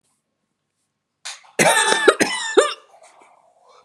{"cough_length": "3.8 s", "cough_amplitude": 32768, "cough_signal_mean_std_ratio": 0.39, "survey_phase": "beta (2021-08-13 to 2022-03-07)", "age": "45-64", "gender": "Female", "wearing_mask": "No", "symptom_new_continuous_cough": true, "smoker_status": "Ex-smoker", "respiratory_condition_asthma": false, "respiratory_condition_other": false, "recruitment_source": "Test and Trace", "submission_delay": "2 days", "covid_test_result": "Positive", "covid_test_method": "RT-qPCR", "covid_ct_value": 21.6, "covid_ct_gene": "ORF1ab gene"}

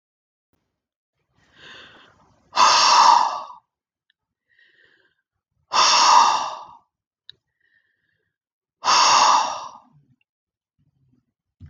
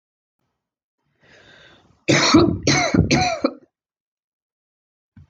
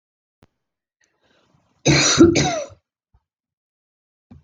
{"exhalation_length": "11.7 s", "exhalation_amplitude": 25090, "exhalation_signal_mean_std_ratio": 0.37, "three_cough_length": "5.3 s", "three_cough_amplitude": 28908, "three_cough_signal_mean_std_ratio": 0.39, "cough_length": "4.4 s", "cough_amplitude": 29557, "cough_signal_mean_std_ratio": 0.31, "survey_phase": "beta (2021-08-13 to 2022-03-07)", "age": "18-44", "gender": "Female", "wearing_mask": "No", "symptom_none": true, "smoker_status": "Never smoked", "respiratory_condition_asthma": false, "respiratory_condition_other": false, "recruitment_source": "REACT", "submission_delay": "2 days", "covid_test_result": "Negative", "covid_test_method": "RT-qPCR"}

